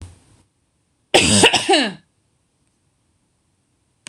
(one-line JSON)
{"cough_length": "4.1 s", "cough_amplitude": 26028, "cough_signal_mean_std_ratio": 0.34, "survey_phase": "beta (2021-08-13 to 2022-03-07)", "age": "18-44", "gender": "Female", "wearing_mask": "No", "symptom_none": true, "smoker_status": "Never smoked", "respiratory_condition_asthma": true, "respiratory_condition_other": false, "recruitment_source": "REACT", "submission_delay": "0 days", "covid_test_result": "Negative", "covid_test_method": "RT-qPCR", "influenza_a_test_result": "Negative", "influenza_b_test_result": "Negative"}